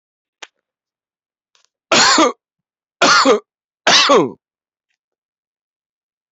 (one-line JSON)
{"three_cough_length": "6.3 s", "three_cough_amplitude": 31120, "three_cough_signal_mean_std_ratio": 0.36, "survey_phase": "beta (2021-08-13 to 2022-03-07)", "age": "18-44", "gender": "Male", "wearing_mask": "Yes", "symptom_none": true, "smoker_status": "Ex-smoker", "respiratory_condition_asthma": false, "respiratory_condition_other": false, "recruitment_source": "REACT", "submission_delay": "1 day", "covid_test_result": "Negative", "covid_test_method": "RT-qPCR"}